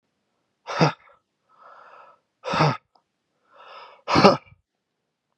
{
  "exhalation_length": "5.4 s",
  "exhalation_amplitude": 32678,
  "exhalation_signal_mean_std_ratio": 0.28,
  "survey_phase": "beta (2021-08-13 to 2022-03-07)",
  "age": "18-44",
  "gender": "Male",
  "wearing_mask": "No",
  "symptom_cough_any": true,
  "symptom_shortness_of_breath": true,
  "symptom_sore_throat": true,
  "symptom_fatigue": true,
  "symptom_fever_high_temperature": true,
  "symptom_onset": "3 days",
  "smoker_status": "Ex-smoker",
  "respiratory_condition_asthma": false,
  "respiratory_condition_other": false,
  "recruitment_source": "Test and Trace",
  "submission_delay": "1 day",
  "covid_test_result": "Positive",
  "covid_test_method": "RT-qPCR",
  "covid_ct_value": 22.9,
  "covid_ct_gene": "ORF1ab gene",
  "covid_ct_mean": 23.3,
  "covid_viral_load": "22000 copies/ml",
  "covid_viral_load_category": "Low viral load (10K-1M copies/ml)"
}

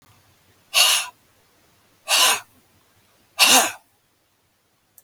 {
  "exhalation_length": "5.0 s",
  "exhalation_amplitude": 32768,
  "exhalation_signal_mean_std_ratio": 0.35,
  "survey_phase": "beta (2021-08-13 to 2022-03-07)",
  "age": "45-64",
  "gender": "Male",
  "wearing_mask": "No",
  "symptom_cough_any": true,
  "symptom_onset": "5 days",
  "smoker_status": "Never smoked",
  "respiratory_condition_asthma": false,
  "respiratory_condition_other": false,
  "recruitment_source": "Test and Trace",
  "submission_delay": "2 days",
  "covid_test_result": "Positive",
  "covid_test_method": "ePCR"
}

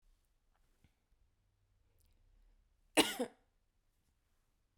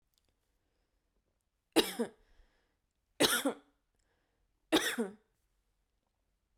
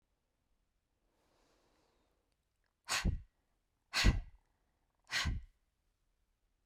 {
  "cough_length": "4.8 s",
  "cough_amplitude": 7949,
  "cough_signal_mean_std_ratio": 0.16,
  "three_cough_length": "6.6 s",
  "three_cough_amplitude": 8570,
  "three_cough_signal_mean_std_ratio": 0.26,
  "exhalation_length": "6.7 s",
  "exhalation_amplitude": 5268,
  "exhalation_signal_mean_std_ratio": 0.27,
  "survey_phase": "beta (2021-08-13 to 2022-03-07)",
  "age": "18-44",
  "gender": "Female",
  "wearing_mask": "No",
  "symptom_none": true,
  "symptom_onset": "12 days",
  "smoker_status": "Never smoked",
  "respiratory_condition_asthma": false,
  "respiratory_condition_other": false,
  "recruitment_source": "REACT",
  "submission_delay": "0 days",
  "covid_test_result": "Negative",
  "covid_test_method": "RT-qPCR"
}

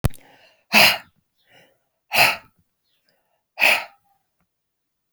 {
  "exhalation_length": "5.1 s",
  "exhalation_amplitude": 32767,
  "exhalation_signal_mean_std_ratio": 0.3,
  "survey_phase": "alpha (2021-03-01 to 2021-08-12)",
  "age": "45-64",
  "gender": "Female",
  "wearing_mask": "No",
  "symptom_none": true,
  "smoker_status": "Ex-smoker",
  "respiratory_condition_asthma": false,
  "respiratory_condition_other": false,
  "recruitment_source": "REACT",
  "submission_delay": "1 day",
  "covid_test_result": "Negative",
  "covid_test_method": "RT-qPCR"
}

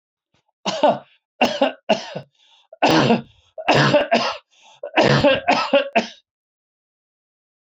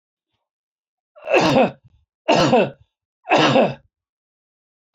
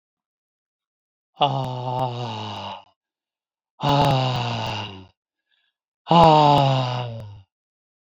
{
  "cough_length": "7.7 s",
  "cough_amplitude": 26137,
  "cough_signal_mean_std_ratio": 0.48,
  "three_cough_length": "4.9 s",
  "three_cough_amplitude": 23256,
  "three_cough_signal_mean_std_ratio": 0.42,
  "exhalation_length": "8.2 s",
  "exhalation_amplitude": 27005,
  "exhalation_signal_mean_std_ratio": 0.45,
  "survey_phase": "alpha (2021-03-01 to 2021-08-12)",
  "age": "45-64",
  "gender": "Male",
  "wearing_mask": "No",
  "symptom_none": true,
  "smoker_status": "Never smoked",
  "respiratory_condition_asthma": false,
  "respiratory_condition_other": false,
  "recruitment_source": "REACT",
  "submission_delay": "1 day",
  "covid_test_result": "Negative",
  "covid_test_method": "RT-qPCR"
}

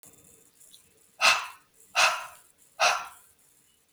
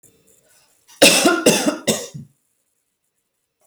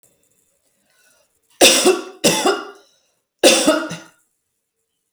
{
  "exhalation_length": "3.9 s",
  "exhalation_amplitude": 16610,
  "exhalation_signal_mean_std_ratio": 0.35,
  "cough_length": "3.7 s",
  "cough_amplitude": 32768,
  "cough_signal_mean_std_ratio": 0.37,
  "three_cough_length": "5.1 s",
  "three_cough_amplitude": 32768,
  "three_cough_signal_mean_std_ratio": 0.38,
  "survey_phase": "alpha (2021-03-01 to 2021-08-12)",
  "age": "45-64",
  "gender": "Female",
  "wearing_mask": "No",
  "symptom_none": true,
  "smoker_status": "Ex-smoker",
  "respiratory_condition_asthma": false,
  "respiratory_condition_other": false,
  "recruitment_source": "REACT",
  "submission_delay": "4 days",
  "covid_test_result": "Negative",
  "covid_test_method": "RT-qPCR"
}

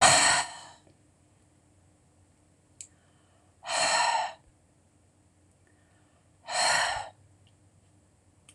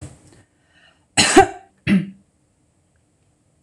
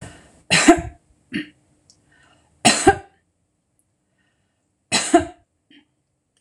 {
  "exhalation_length": "8.5 s",
  "exhalation_amplitude": 16774,
  "exhalation_signal_mean_std_ratio": 0.35,
  "cough_length": "3.6 s",
  "cough_amplitude": 26028,
  "cough_signal_mean_std_ratio": 0.29,
  "three_cough_length": "6.4 s",
  "three_cough_amplitude": 26028,
  "three_cough_signal_mean_std_ratio": 0.28,
  "survey_phase": "beta (2021-08-13 to 2022-03-07)",
  "age": "65+",
  "gender": "Female",
  "wearing_mask": "No",
  "symptom_none": true,
  "smoker_status": "Never smoked",
  "respiratory_condition_asthma": false,
  "respiratory_condition_other": false,
  "recruitment_source": "REACT",
  "submission_delay": "1 day",
  "covid_test_result": "Negative",
  "covid_test_method": "RT-qPCR"
}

